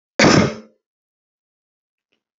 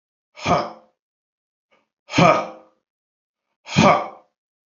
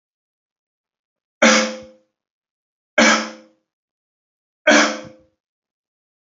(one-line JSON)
{"cough_length": "2.4 s", "cough_amplitude": 27794, "cough_signal_mean_std_ratio": 0.29, "exhalation_length": "4.8 s", "exhalation_amplitude": 27899, "exhalation_signal_mean_std_ratio": 0.32, "three_cough_length": "6.3 s", "three_cough_amplitude": 29971, "three_cough_signal_mean_std_ratio": 0.29, "survey_phase": "beta (2021-08-13 to 2022-03-07)", "age": "45-64", "gender": "Male", "wearing_mask": "No", "symptom_runny_or_blocked_nose": true, "smoker_status": "Never smoked", "respiratory_condition_asthma": false, "respiratory_condition_other": false, "recruitment_source": "Test and Trace", "submission_delay": "0 days", "covid_test_result": "Negative", "covid_test_method": "LFT"}